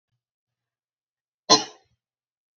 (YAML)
cough_length: 2.6 s
cough_amplitude: 28413
cough_signal_mean_std_ratio: 0.16
survey_phase: alpha (2021-03-01 to 2021-08-12)
age: 45-64
gender: Female
wearing_mask: 'No'
symptom_none: true
smoker_status: Never smoked
respiratory_condition_asthma: false
respiratory_condition_other: false
recruitment_source: REACT
submission_delay: 2 days
covid_test_result: Negative
covid_test_method: RT-qPCR